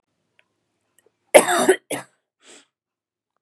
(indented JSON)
{
  "cough_length": "3.4 s",
  "cough_amplitude": 32768,
  "cough_signal_mean_std_ratio": 0.24,
  "survey_phase": "beta (2021-08-13 to 2022-03-07)",
  "age": "18-44",
  "gender": "Female",
  "wearing_mask": "No",
  "symptom_cough_any": true,
  "symptom_runny_or_blocked_nose": true,
  "symptom_sore_throat": true,
  "symptom_headache": true,
  "smoker_status": "Ex-smoker",
  "respiratory_condition_asthma": false,
  "respiratory_condition_other": false,
  "recruitment_source": "Test and Trace",
  "submission_delay": "1 day",
  "covid_test_result": "Positive",
  "covid_test_method": "LFT"
}